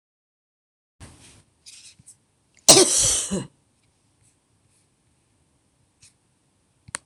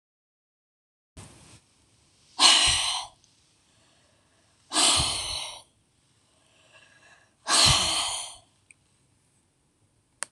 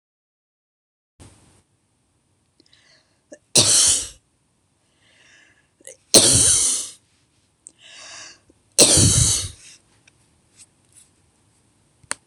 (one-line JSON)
{"cough_length": "7.1 s", "cough_amplitude": 26028, "cough_signal_mean_std_ratio": 0.22, "exhalation_length": "10.3 s", "exhalation_amplitude": 23281, "exhalation_signal_mean_std_ratio": 0.35, "three_cough_length": "12.3 s", "three_cough_amplitude": 26028, "three_cough_signal_mean_std_ratio": 0.31, "survey_phase": "alpha (2021-03-01 to 2021-08-12)", "age": "65+", "gender": "Female", "wearing_mask": "No", "symptom_none": true, "smoker_status": "Never smoked", "respiratory_condition_asthma": false, "respiratory_condition_other": false, "recruitment_source": "REACT", "submission_delay": "3 days", "covid_test_result": "Negative", "covid_test_method": "RT-qPCR"}